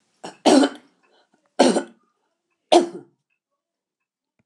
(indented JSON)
{
  "three_cough_length": "4.5 s",
  "three_cough_amplitude": 29204,
  "three_cough_signal_mean_std_ratio": 0.29,
  "survey_phase": "beta (2021-08-13 to 2022-03-07)",
  "age": "65+",
  "gender": "Female",
  "wearing_mask": "No",
  "symptom_cough_any": true,
  "smoker_status": "Never smoked",
  "respiratory_condition_asthma": false,
  "respiratory_condition_other": false,
  "recruitment_source": "REACT",
  "submission_delay": "2 days",
  "covid_test_result": "Negative",
  "covid_test_method": "RT-qPCR",
  "influenza_a_test_result": "Negative",
  "influenza_b_test_result": "Negative"
}